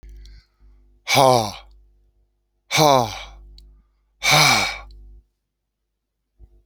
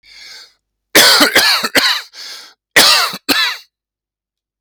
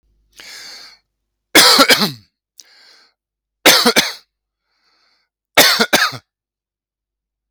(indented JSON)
{
  "exhalation_length": "6.7 s",
  "exhalation_amplitude": 30453,
  "exhalation_signal_mean_std_ratio": 0.36,
  "cough_length": "4.6 s",
  "cough_amplitude": 32768,
  "cough_signal_mean_std_ratio": 0.5,
  "three_cough_length": "7.5 s",
  "three_cough_amplitude": 32768,
  "three_cough_signal_mean_std_ratio": 0.35,
  "survey_phase": "alpha (2021-03-01 to 2021-08-12)",
  "age": "65+",
  "gender": "Male",
  "wearing_mask": "No",
  "symptom_none": true,
  "smoker_status": "Ex-smoker",
  "respiratory_condition_asthma": false,
  "respiratory_condition_other": false,
  "recruitment_source": "REACT",
  "submission_delay": "9 days",
  "covid_test_result": "Negative",
  "covid_test_method": "RT-qPCR"
}